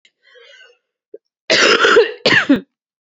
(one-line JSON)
{"cough_length": "3.2 s", "cough_amplitude": 30222, "cough_signal_mean_std_ratio": 0.46, "survey_phase": "beta (2021-08-13 to 2022-03-07)", "age": "18-44", "gender": "Female", "wearing_mask": "No", "symptom_cough_any": true, "symptom_runny_or_blocked_nose": true, "symptom_sore_throat": true, "symptom_fever_high_temperature": true, "symptom_change_to_sense_of_smell_or_taste": true, "symptom_onset": "3 days", "smoker_status": "Never smoked", "respiratory_condition_asthma": false, "respiratory_condition_other": false, "recruitment_source": "Test and Trace", "submission_delay": "2 days", "covid_test_result": "Positive", "covid_test_method": "RT-qPCR", "covid_ct_value": 20.5, "covid_ct_gene": "ORF1ab gene", "covid_ct_mean": 20.7, "covid_viral_load": "160000 copies/ml", "covid_viral_load_category": "Low viral load (10K-1M copies/ml)"}